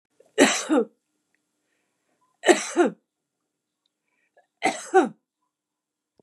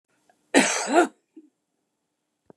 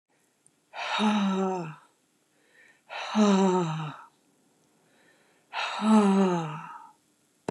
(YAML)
three_cough_length: 6.2 s
three_cough_amplitude: 26982
three_cough_signal_mean_std_ratio: 0.3
cough_length: 2.6 s
cough_amplitude: 21572
cough_signal_mean_std_ratio: 0.32
exhalation_length: 7.5 s
exhalation_amplitude: 10714
exhalation_signal_mean_std_ratio: 0.53
survey_phase: beta (2021-08-13 to 2022-03-07)
age: 65+
gender: Female
wearing_mask: 'No'
symptom_none: true
smoker_status: Ex-smoker
respiratory_condition_asthma: false
respiratory_condition_other: false
recruitment_source: REACT
submission_delay: 1 day
covid_test_result: Negative
covid_test_method: RT-qPCR
influenza_a_test_result: Negative
influenza_b_test_result: Negative